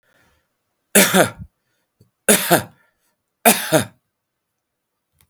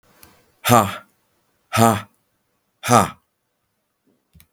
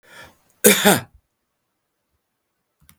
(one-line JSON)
{"three_cough_length": "5.3 s", "three_cough_amplitude": 32768, "three_cough_signal_mean_std_ratio": 0.31, "exhalation_length": "4.5 s", "exhalation_amplitude": 32768, "exhalation_signal_mean_std_ratio": 0.29, "cough_length": "3.0 s", "cough_amplitude": 32768, "cough_signal_mean_std_ratio": 0.25, "survey_phase": "beta (2021-08-13 to 2022-03-07)", "age": "65+", "gender": "Male", "wearing_mask": "No", "symptom_none": true, "smoker_status": "Never smoked", "respiratory_condition_asthma": false, "respiratory_condition_other": false, "recruitment_source": "REACT", "submission_delay": "1 day", "covid_test_result": "Negative", "covid_test_method": "RT-qPCR", "influenza_a_test_result": "Negative", "influenza_b_test_result": "Negative"}